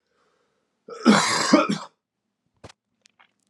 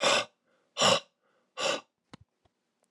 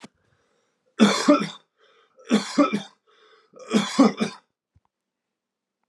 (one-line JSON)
{"cough_length": "3.5 s", "cough_amplitude": 27504, "cough_signal_mean_std_ratio": 0.34, "exhalation_length": "2.9 s", "exhalation_amplitude": 10161, "exhalation_signal_mean_std_ratio": 0.37, "three_cough_length": "5.9 s", "three_cough_amplitude": 24494, "three_cough_signal_mean_std_ratio": 0.35, "survey_phase": "alpha (2021-03-01 to 2021-08-12)", "age": "18-44", "gender": "Male", "wearing_mask": "No", "symptom_cough_any": true, "symptom_onset": "4 days", "smoker_status": "Current smoker (e-cigarettes or vapes only)", "respiratory_condition_asthma": false, "respiratory_condition_other": false, "recruitment_source": "Test and Trace", "submission_delay": "1 day", "covid_test_result": "Positive", "covid_test_method": "RT-qPCR", "covid_ct_value": 11.1, "covid_ct_gene": "N gene", "covid_ct_mean": 11.3, "covid_viral_load": "190000000 copies/ml", "covid_viral_load_category": "High viral load (>1M copies/ml)"}